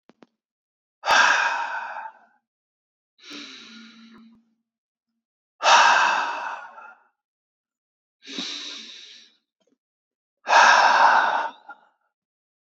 {
  "exhalation_length": "12.7 s",
  "exhalation_amplitude": 24146,
  "exhalation_signal_mean_std_ratio": 0.38,
  "survey_phase": "beta (2021-08-13 to 2022-03-07)",
  "age": "18-44",
  "gender": "Male",
  "wearing_mask": "No",
  "symptom_new_continuous_cough": true,
  "symptom_runny_or_blocked_nose": true,
  "symptom_shortness_of_breath": true,
  "symptom_diarrhoea": true,
  "symptom_fatigue": true,
  "symptom_headache": true,
  "symptom_onset": "6 days",
  "smoker_status": "Never smoked",
  "respiratory_condition_asthma": false,
  "respiratory_condition_other": false,
  "recruitment_source": "Test and Trace",
  "submission_delay": "1 day",
  "covid_test_result": "Positive",
  "covid_test_method": "RT-qPCR"
}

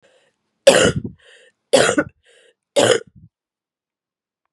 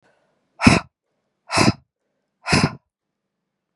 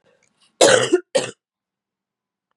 {
  "three_cough_length": "4.5 s",
  "three_cough_amplitude": 32768,
  "three_cough_signal_mean_std_ratio": 0.33,
  "exhalation_length": "3.8 s",
  "exhalation_amplitude": 32768,
  "exhalation_signal_mean_std_ratio": 0.29,
  "cough_length": "2.6 s",
  "cough_amplitude": 32767,
  "cough_signal_mean_std_ratio": 0.32,
  "survey_phase": "beta (2021-08-13 to 2022-03-07)",
  "age": "45-64",
  "gender": "Female",
  "wearing_mask": "No",
  "symptom_cough_any": true,
  "symptom_headache": true,
  "symptom_other": true,
  "symptom_onset": "3 days",
  "smoker_status": "Never smoked",
  "respiratory_condition_asthma": false,
  "respiratory_condition_other": false,
  "recruitment_source": "Test and Trace",
  "submission_delay": "2 days",
  "covid_test_result": "Positive",
  "covid_test_method": "RT-qPCR",
  "covid_ct_value": 13.9,
  "covid_ct_gene": "ORF1ab gene"
}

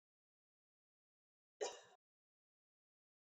{
  "cough_length": "3.3 s",
  "cough_amplitude": 1020,
  "cough_signal_mean_std_ratio": 0.17,
  "survey_phase": "beta (2021-08-13 to 2022-03-07)",
  "age": "18-44",
  "gender": "Female",
  "wearing_mask": "No",
  "symptom_cough_any": true,
  "symptom_new_continuous_cough": true,
  "symptom_runny_or_blocked_nose": true,
  "symptom_sore_throat": true,
  "symptom_fatigue": true,
  "symptom_fever_high_temperature": true,
  "symptom_headache": true,
  "symptom_other": true,
  "symptom_onset": "3 days",
  "smoker_status": "Never smoked",
  "respiratory_condition_asthma": false,
  "respiratory_condition_other": false,
  "recruitment_source": "Test and Trace",
  "submission_delay": "2 days",
  "covid_test_result": "Positive",
  "covid_test_method": "RT-qPCR"
}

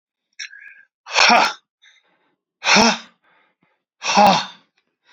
{
  "exhalation_length": "5.1 s",
  "exhalation_amplitude": 32768,
  "exhalation_signal_mean_std_ratio": 0.37,
  "survey_phase": "beta (2021-08-13 to 2022-03-07)",
  "age": "45-64",
  "gender": "Male",
  "wearing_mask": "No",
  "symptom_cough_any": true,
  "smoker_status": "Never smoked",
  "respiratory_condition_asthma": false,
  "respiratory_condition_other": false,
  "recruitment_source": "REACT",
  "submission_delay": "4 days",
  "covid_test_result": "Positive",
  "covid_test_method": "RT-qPCR",
  "covid_ct_value": 25.0,
  "covid_ct_gene": "N gene",
  "influenza_a_test_result": "Negative",
  "influenza_b_test_result": "Negative"
}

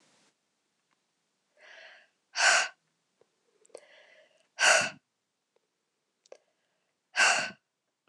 {
  "exhalation_length": "8.1 s",
  "exhalation_amplitude": 11615,
  "exhalation_signal_mean_std_ratio": 0.27,
  "survey_phase": "beta (2021-08-13 to 2022-03-07)",
  "age": "45-64",
  "gender": "Female",
  "wearing_mask": "No",
  "symptom_cough_any": true,
  "symptom_runny_or_blocked_nose": true,
  "symptom_fatigue": true,
  "symptom_fever_high_temperature": true,
  "symptom_change_to_sense_of_smell_or_taste": true,
  "symptom_onset": "3 days",
  "smoker_status": "Never smoked",
  "respiratory_condition_asthma": false,
  "respiratory_condition_other": false,
  "recruitment_source": "Test and Trace",
  "submission_delay": "1 day",
  "covid_test_result": "Positive",
  "covid_test_method": "ePCR"
}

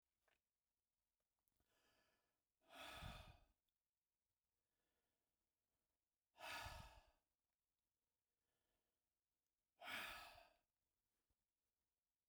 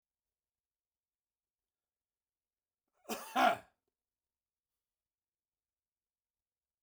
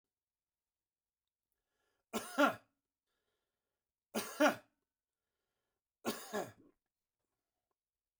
{
  "exhalation_length": "12.3 s",
  "exhalation_amplitude": 338,
  "exhalation_signal_mean_std_ratio": 0.31,
  "cough_length": "6.8 s",
  "cough_amplitude": 4851,
  "cough_signal_mean_std_ratio": 0.16,
  "three_cough_length": "8.2 s",
  "three_cough_amplitude": 4158,
  "three_cough_signal_mean_std_ratio": 0.22,
  "survey_phase": "beta (2021-08-13 to 2022-03-07)",
  "age": "45-64",
  "gender": "Male",
  "wearing_mask": "No",
  "symptom_none": true,
  "smoker_status": "Never smoked",
  "respiratory_condition_asthma": false,
  "respiratory_condition_other": false,
  "recruitment_source": "REACT",
  "submission_delay": "3 days",
  "covid_test_result": "Negative",
  "covid_test_method": "RT-qPCR",
  "influenza_a_test_result": "Negative",
  "influenza_b_test_result": "Negative"
}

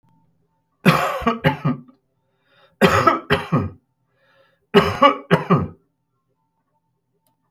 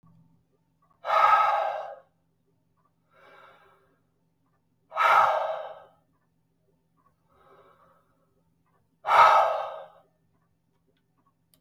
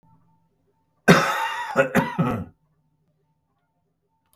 {
  "three_cough_length": "7.5 s",
  "three_cough_amplitude": 32768,
  "three_cough_signal_mean_std_ratio": 0.39,
  "exhalation_length": "11.6 s",
  "exhalation_amplitude": 18297,
  "exhalation_signal_mean_std_ratio": 0.33,
  "cough_length": "4.4 s",
  "cough_amplitude": 32768,
  "cough_signal_mean_std_ratio": 0.36,
  "survey_phase": "beta (2021-08-13 to 2022-03-07)",
  "age": "65+",
  "gender": "Male",
  "wearing_mask": "No",
  "symptom_none": true,
  "smoker_status": "Ex-smoker",
  "respiratory_condition_asthma": false,
  "respiratory_condition_other": false,
  "recruitment_source": "REACT",
  "submission_delay": "1 day",
  "covid_test_result": "Negative",
  "covid_test_method": "RT-qPCR",
  "influenza_a_test_result": "Negative",
  "influenza_b_test_result": "Negative"
}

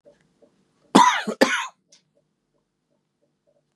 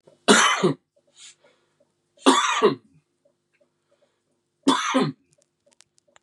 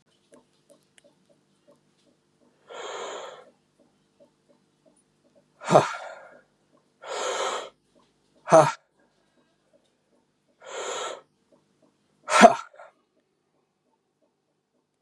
{
  "cough_length": "3.8 s",
  "cough_amplitude": 31616,
  "cough_signal_mean_std_ratio": 0.27,
  "three_cough_length": "6.2 s",
  "three_cough_amplitude": 29712,
  "three_cough_signal_mean_std_ratio": 0.35,
  "exhalation_length": "15.0 s",
  "exhalation_amplitude": 32754,
  "exhalation_signal_mean_std_ratio": 0.21,
  "survey_phase": "beta (2021-08-13 to 2022-03-07)",
  "age": "45-64",
  "gender": "Male",
  "wearing_mask": "No",
  "symptom_cough_any": true,
  "symptom_abdominal_pain": true,
  "symptom_fatigue": true,
  "symptom_fever_high_temperature": true,
  "symptom_headache": true,
  "symptom_change_to_sense_of_smell_or_taste": true,
  "symptom_loss_of_taste": true,
  "symptom_onset": "3 days",
  "smoker_status": "Never smoked",
  "respiratory_condition_asthma": false,
  "respiratory_condition_other": false,
  "recruitment_source": "Test and Trace",
  "submission_delay": "2 days",
  "covid_test_result": "Positive",
  "covid_test_method": "RT-qPCR"
}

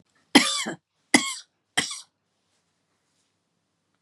{
  "three_cough_length": "4.0 s",
  "three_cough_amplitude": 30746,
  "three_cough_signal_mean_std_ratio": 0.25,
  "survey_phase": "beta (2021-08-13 to 2022-03-07)",
  "age": "45-64",
  "gender": "Female",
  "wearing_mask": "No",
  "symptom_none": true,
  "smoker_status": "Never smoked",
  "respiratory_condition_asthma": false,
  "respiratory_condition_other": false,
  "recruitment_source": "REACT",
  "submission_delay": "1 day",
  "covid_test_result": "Negative",
  "covid_test_method": "RT-qPCR",
  "influenza_a_test_result": "Negative",
  "influenza_b_test_result": "Negative"
}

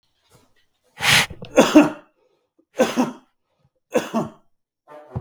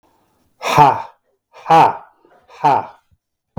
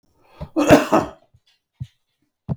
{
  "three_cough_length": "5.2 s",
  "three_cough_amplitude": 32768,
  "three_cough_signal_mean_std_ratio": 0.34,
  "exhalation_length": "3.6 s",
  "exhalation_amplitude": 32768,
  "exhalation_signal_mean_std_ratio": 0.39,
  "cough_length": "2.6 s",
  "cough_amplitude": 32768,
  "cough_signal_mean_std_ratio": 0.32,
  "survey_phase": "beta (2021-08-13 to 2022-03-07)",
  "age": "45-64",
  "gender": "Male",
  "wearing_mask": "No",
  "symptom_none": true,
  "smoker_status": "Never smoked",
  "respiratory_condition_asthma": false,
  "respiratory_condition_other": false,
  "recruitment_source": "REACT",
  "submission_delay": "2 days",
  "covid_test_result": "Negative",
  "covid_test_method": "RT-qPCR",
  "influenza_a_test_result": "Negative",
  "influenza_b_test_result": "Negative"
}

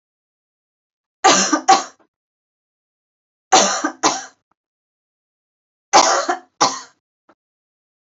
{
  "three_cough_length": "8.0 s",
  "three_cough_amplitude": 32767,
  "three_cough_signal_mean_std_ratio": 0.32,
  "survey_phase": "beta (2021-08-13 to 2022-03-07)",
  "age": "18-44",
  "gender": "Female",
  "wearing_mask": "No",
  "symptom_cough_any": true,
  "symptom_onset": "6 days",
  "smoker_status": "Never smoked",
  "respiratory_condition_asthma": false,
  "respiratory_condition_other": false,
  "recruitment_source": "REACT",
  "submission_delay": "1 day",
  "covid_test_result": "Negative",
  "covid_test_method": "RT-qPCR",
  "influenza_a_test_result": "Negative",
  "influenza_b_test_result": "Negative"
}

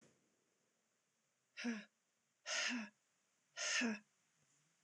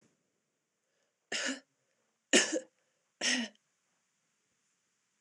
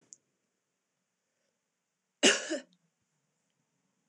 {
  "exhalation_length": "4.8 s",
  "exhalation_amplitude": 1408,
  "exhalation_signal_mean_std_ratio": 0.4,
  "three_cough_length": "5.2 s",
  "three_cough_amplitude": 9947,
  "three_cough_signal_mean_std_ratio": 0.27,
  "cough_length": "4.1 s",
  "cough_amplitude": 11243,
  "cough_signal_mean_std_ratio": 0.19,
  "survey_phase": "beta (2021-08-13 to 2022-03-07)",
  "age": "18-44",
  "gender": "Female",
  "wearing_mask": "No",
  "symptom_runny_or_blocked_nose": true,
  "symptom_fatigue": true,
  "symptom_headache": true,
  "symptom_other": true,
  "symptom_onset": "3 days",
  "smoker_status": "Never smoked",
  "respiratory_condition_asthma": false,
  "respiratory_condition_other": false,
  "recruitment_source": "Test and Trace",
  "submission_delay": "1 day",
  "covid_test_result": "Positive",
  "covid_test_method": "RT-qPCR"
}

